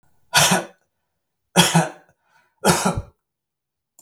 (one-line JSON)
{"three_cough_length": "4.0 s", "three_cough_amplitude": 32768, "three_cough_signal_mean_std_ratio": 0.37, "survey_phase": "beta (2021-08-13 to 2022-03-07)", "age": "65+", "gender": "Male", "wearing_mask": "No", "symptom_runny_or_blocked_nose": true, "smoker_status": "Never smoked", "respiratory_condition_asthma": false, "respiratory_condition_other": false, "recruitment_source": "Test and Trace", "submission_delay": "0 days", "covid_test_result": "Negative", "covid_test_method": "LFT"}